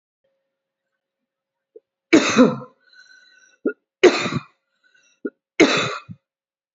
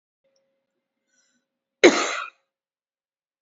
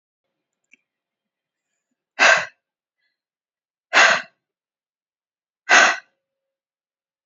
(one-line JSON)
{"three_cough_length": "6.7 s", "three_cough_amplitude": 28429, "three_cough_signal_mean_std_ratio": 0.29, "cough_length": "3.4 s", "cough_amplitude": 27827, "cough_signal_mean_std_ratio": 0.2, "exhalation_length": "7.3 s", "exhalation_amplitude": 32693, "exhalation_signal_mean_std_ratio": 0.25, "survey_phase": "alpha (2021-03-01 to 2021-08-12)", "age": "45-64", "gender": "Female", "wearing_mask": "No", "symptom_none": true, "symptom_onset": "10 days", "smoker_status": "Never smoked", "respiratory_condition_asthma": false, "respiratory_condition_other": false, "recruitment_source": "REACT", "submission_delay": "2 days", "covid_test_result": "Negative", "covid_test_method": "RT-qPCR", "covid_ct_value": 41.0, "covid_ct_gene": "N gene"}